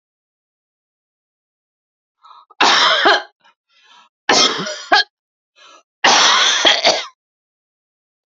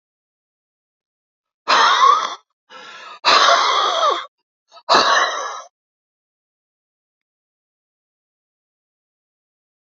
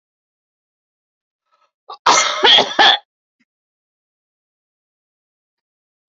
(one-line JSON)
{"three_cough_length": "8.4 s", "three_cough_amplitude": 32768, "three_cough_signal_mean_std_ratio": 0.41, "exhalation_length": "9.9 s", "exhalation_amplitude": 32767, "exhalation_signal_mean_std_ratio": 0.38, "cough_length": "6.1 s", "cough_amplitude": 32768, "cough_signal_mean_std_ratio": 0.28, "survey_phase": "alpha (2021-03-01 to 2021-08-12)", "age": "65+", "gender": "Female", "wearing_mask": "No", "symptom_none": true, "smoker_status": "Ex-smoker", "respiratory_condition_asthma": false, "respiratory_condition_other": false, "recruitment_source": "REACT", "submission_delay": "3 days", "covid_test_result": "Negative", "covid_test_method": "RT-qPCR"}